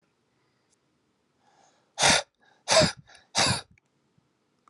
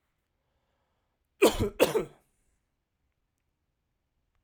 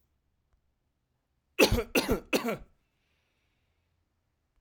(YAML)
exhalation_length: 4.7 s
exhalation_amplitude: 16062
exhalation_signal_mean_std_ratio: 0.3
cough_length: 4.4 s
cough_amplitude: 13120
cough_signal_mean_std_ratio: 0.23
three_cough_length: 4.6 s
three_cough_amplitude: 13272
three_cough_signal_mean_std_ratio: 0.28
survey_phase: alpha (2021-03-01 to 2021-08-12)
age: 18-44
gender: Male
wearing_mask: 'No'
symptom_none: true
smoker_status: Never smoked
respiratory_condition_asthma: false
respiratory_condition_other: false
recruitment_source: REACT
submission_delay: 2 days
covid_test_result: Negative
covid_test_method: RT-qPCR